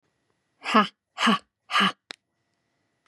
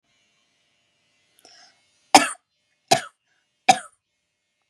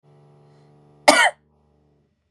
{
  "exhalation_length": "3.1 s",
  "exhalation_amplitude": 21500,
  "exhalation_signal_mean_std_ratio": 0.34,
  "three_cough_length": "4.7 s",
  "three_cough_amplitude": 32768,
  "three_cough_signal_mean_std_ratio": 0.17,
  "cough_length": "2.3 s",
  "cough_amplitude": 32768,
  "cough_signal_mean_std_ratio": 0.25,
  "survey_phase": "beta (2021-08-13 to 2022-03-07)",
  "age": "18-44",
  "gender": "Female",
  "wearing_mask": "No",
  "symptom_none": true,
  "smoker_status": "Never smoked",
  "respiratory_condition_asthma": false,
  "respiratory_condition_other": false,
  "recruitment_source": "Test and Trace",
  "submission_delay": "1 day",
  "covid_test_result": "Negative",
  "covid_test_method": "RT-qPCR"
}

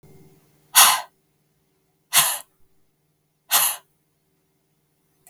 {
  "exhalation_length": "5.3 s",
  "exhalation_amplitude": 32768,
  "exhalation_signal_mean_std_ratio": 0.27,
  "survey_phase": "beta (2021-08-13 to 2022-03-07)",
  "age": "45-64",
  "gender": "Female",
  "wearing_mask": "No",
  "symptom_none": true,
  "symptom_onset": "13 days",
  "smoker_status": "Never smoked",
  "respiratory_condition_asthma": false,
  "respiratory_condition_other": false,
  "recruitment_source": "REACT",
  "submission_delay": "3 days",
  "covid_test_result": "Negative",
  "covid_test_method": "RT-qPCR",
  "influenza_a_test_result": "Negative",
  "influenza_b_test_result": "Negative"
}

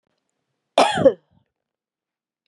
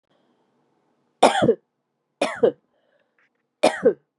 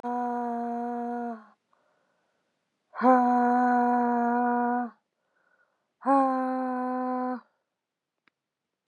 {
  "cough_length": "2.5 s",
  "cough_amplitude": 27311,
  "cough_signal_mean_std_ratio": 0.26,
  "three_cough_length": "4.2 s",
  "three_cough_amplitude": 30853,
  "three_cough_signal_mean_std_ratio": 0.3,
  "exhalation_length": "8.9 s",
  "exhalation_amplitude": 12229,
  "exhalation_signal_mean_std_ratio": 0.58,
  "survey_phase": "beta (2021-08-13 to 2022-03-07)",
  "age": "45-64",
  "gender": "Female",
  "wearing_mask": "No",
  "symptom_cough_any": true,
  "symptom_runny_or_blocked_nose": true,
  "symptom_sore_throat": true,
  "symptom_fever_high_temperature": true,
  "symptom_onset": "4 days",
  "smoker_status": "Current smoker (1 to 10 cigarettes per day)",
  "respiratory_condition_asthma": false,
  "respiratory_condition_other": false,
  "recruitment_source": "Test and Trace",
  "submission_delay": "1 day",
  "covid_test_result": "Positive",
  "covid_test_method": "ePCR"
}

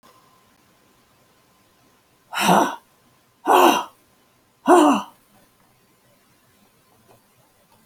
{
  "exhalation_length": "7.9 s",
  "exhalation_amplitude": 27388,
  "exhalation_signal_mean_std_ratio": 0.3,
  "survey_phase": "alpha (2021-03-01 to 2021-08-12)",
  "age": "65+",
  "gender": "Female",
  "wearing_mask": "No",
  "symptom_change_to_sense_of_smell_or_taste": true,
  "symptom_loss_of_taste": true,
  "symptom_onset": "12 days",
  "smoker_status": "Ex-smoker",
  "respiratory_condition_asthma": false,
  "respiratory_condition_other": false,
  "recruitment_source": "REACT",
  "submission_delay": "2 days",
  "covid_test_result": "Negative",
  "covid_test_method": "RT-qPCR"
}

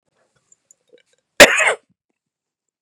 {
  "cough_length": "2.8 s",
  "cough_amplitude": 32768,
  "cough_signal_mean_std_ratio": 0.23,
  "survey_phase": "beta (2021-08-13 to 2022-03-07)",
  "age": "45-64",
  "gender": "Male",
  "wearing_mask": "No",
  "symptom_other": true,
  "smoker_status": "Never smoked",
  "respiratory_condition_asthma": false,
  "respiratory_condition_other": false,
  "recruitment_source": "Test and Trace",
  "submission_delay": "2 days",
  "covid_test_result": "Positive",
  "covid_test_method": "RT-qPCR",
  "covid_ct_value": 29.8,
  "covid_ct_gene": "ORF1ab gene",
  "covid_ct_mean": 30.4,
  "covid_viral_load": "110 copies/ml",
  "covid_viral_load_category": "Minimal viral load (< 10K copies/ml)"
}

